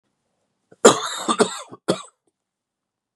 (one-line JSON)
{"cough_length": "3.2 s", "cough_amplitude": 32768, "cough_signal_mean_std_ratio": 0.28, "survey_phase": "beta (2021-08-13 to 2022-03-07)", "age": "45-64", "gender": "Male", "wearing_mask": "No", "symptom_cough_any": true, "symptom_sore_throat": true, "symptom_fatigue": true, "symptom_onset": "3 days", "smoker_status": "Never smoked", "respiratory_condition_asthma": false, "respiratory_condition_other": false, "recruitment_source": "REACT", "submission_delay": "1 day", "covid_test_result": "Positive", "covid_test_method": "RT-qPCR", "covid_ct_value": 24.9, "covid_ct_gene": "E gene", "influenza_a_test_result": "Negative", "influenza_b_test_result": "Negative"}